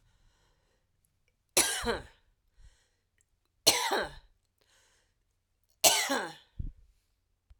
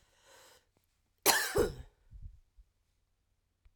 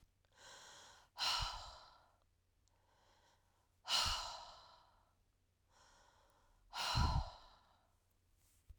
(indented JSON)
{
  "three_cough_length": "7.6 s",
  "three_cough_amplitude": 16809,
  "three_cough_signal_mean_std_ratio": 0.3,
  "cough_length": "3.8 s",
  "cough_amplitude": 10600,
  "cough_signal_mean_std_ratio": 0.29,
  "exhalation_length": "8.8 s",
  "exhalation_amplitude": 2310,
  "exhalation_signal_mean_std_ratio": 0.37,
  "survey_phase": "alpha (2021-03-01 to 2021-08-12)",
  "age": "45-64",
  "gender": "Female",
  "wearing_mask": "No",
  "symptom_cough_any": true,
  "symptom_fever_high_temperature": true,
  "symptom_change_to_sense_of_smell_or_taste": true,
  "smoker_status": "Never smoked",
  "respiratory_condition_asthma": false,
  "respiratory_condition_other": false,
  "recruitment_source": "Test and Trace",
  "submission_delay": "2 days",
  "covid_test_result": "Positive",
  "covid_test_method": "RT-qPCR"
}